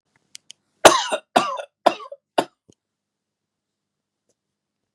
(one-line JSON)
{"cough_length": "4.9 s", "cough_amplitude": 32768, "cough_signal_mean_std_ratio": 0.22, "survey_phase": "beta (2021-08-13 to 2022-03-07)", "age": "45-64", "gender": "Male", "wearing_mask": "No", "symptom_fatigue": true, "symptom_onset": "12 days", "smoker_status": "Ex-smoker", "respiratory_condition_asthma": false, "respiratory_condition_other": false, "recruitment_source": "REACT", "submission_delay": "1 day", "covid_test_result": "Negative", "covid_test_method": "RT-qPCR", "influenza_a_test_result": "Negative", "influenza_b_test_result": "Negative"}